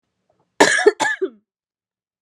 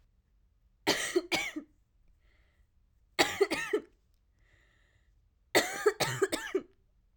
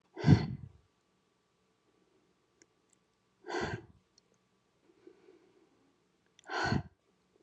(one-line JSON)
{"cough_length": "2.2 s", "cough_amplitude": 32767, "cough_signal_mean_std_ratio": 0.35, "three_cough_length": "7.2 s", "three_cough_amplitude": 10358, "three_cough_signal_mean_std_ratio": 0.38, "exhalation_length": "7.4 s", "exhalation_amplitude": 9398, "exhalation_signal_mean_std_ratio": 0.23, "survey_phase": "alpha (2021-03-01 to 2021-08-12)", "age": "18-44", "gender": "Female", "wearing_mask": "No", "symptom_cough_any": true, "symptom_fatigue": true, "symptom_headache": true, "smoker_status": "Never smoked", "respiratory_condition_asthma": false, "respiratory_condition_other": false, "recruitment_source": "Test and Trace", "submission_delay": "1 day", "covid_test_result": "Positive", "covid_test_method": "RT-qPCR", "covid_ct_value": 35.7, "covid_ct_gene": "N gene"}